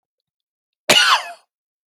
cough_length: 1.9 s
cough_amplitude: 31013
cough_signal_mean_std_ratio: 0.34
survey_phase: alpha (2021-03-01 to 2021-08-12)
age: 45-64
gender: Male
wearing_mask: 'No'
symptom_none: true
smoker_status: Ex-smoker
respiratory_condition_asthma: false
respiratory_condition_other: false
recruitment_source: REACT
submission_delay: 1 day
covid_test_result: Negative
covid_test_method: RT-qPCR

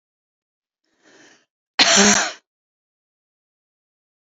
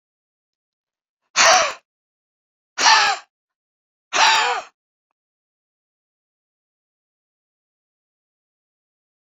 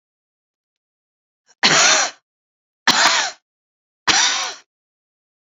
cough_length: 4.4 s
cough_amplitude: 32767
cough_signal_mean_std_ratio: 0.27
exhalation_length: 9.2 s
exhalation_amplitude: 27770
exhalation_signal_mean_std_ratio: 0.28
three_cough_length: 5.5 s
three_cough_amplitude: 32497
three_cough_signal_mean_std_ratio: 0.39
survey_phase: beta (2021-08-13 to 2022-03-07)
age: 65+
gender: Female
wearing_mask: 'No'
symptom_none: true
smoker_status: Never smoked
respiratory_condition_asthma: true
respiratory_condition_other: false
recruitment_source: REACT
submission_delay: 1 day
covid_test_result: Negative
covid_test_method: RT-qPCR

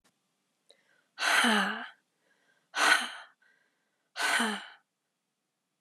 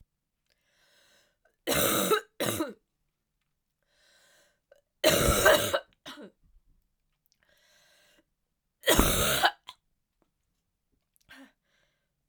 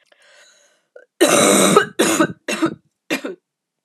exhalation_length: 5.8 s
exhalation_amplitude: 12241
exhalation_signal_mean_std_ratio: 0.39
three_cough_length: 12.3 s
three_cough_amplitude: 16595
three_cough_signal_mean_std_ratio: 0.33
cough_length: 3.8 s
cough_amplitude: 32672
cough_signal_mean_std_ratio: 0.47
survey_phase: alpha (2021-03-01 to 2021-08-12)
age: 18-44
gender: Female
wearing_mask: 'No'
symptom_cough_any: true
symptom_shortness_of_breath: true
symptom_diarrhoea: true
symptom_fatigue: true
symptom_fever_high_temperature: true
symptom_change_to_sense_of_smell_or_taste: true
smoker_status: Never smoked
respiratory_condition_asthma: true
respiratory_condition_other: false
recruitment_source: Test and Trace
submission_delay: 2 days
covid_test_result: Positive
covid_test_method: LFT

